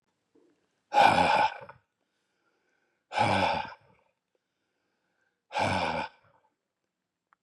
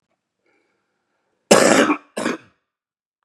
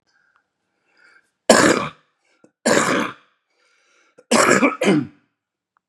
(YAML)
exhalation_length: 7.4 s
exhalation_amplitude: 16071
exhalation_signal_mean_std_ratio: 0.37
cough_length: 3.2 s
cough_amplitude: 32768
cough_signal_mean_std_ratio: 0.32
three_cough_length: 5.9 s
three_cough_amplitude: 32768
three_cough_signal_mean_std_ratio: 0.39
survey_phase: beta (2021-08-13 to 2022-03-07)
age: 45-64
gender: Male
wearing_mask: 'No'
symptom_cough_any: true
smoker_status: Ex-smoker
respiratory_condition_asthma: false
respiratory_condition_other: false
recruitment_source: REACT
submission_delay: 1 day
covid_test_result: Negative
covid_test_method: RT-qPCR
influenza_a_test_result: Unknown/Void
influenza_b_test_result: Unknown/Void